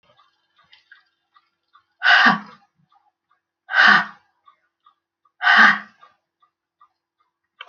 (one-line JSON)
{"exhalation_length": "7.7 s", "exhalation_amplitude": 28569, "exhalation_signal_mean_std_ratio": 0.29, "survey_phase": "alpha (2021-03-01 to 2021-08-12)", "age": "65+", "gender": "Female", "wearing_mask": "No", "symptom_fatigue": true, "symptom_headache": true, "smoker_status": "Ex-smoker", "respiratory_condition_asthma": false, "respiratory_condition_other": false, "recruitment_source": "REACT", "submission_delay": "2 days", "covid_test_result": "Negative", "covid_test_method": "RT-qPCR"}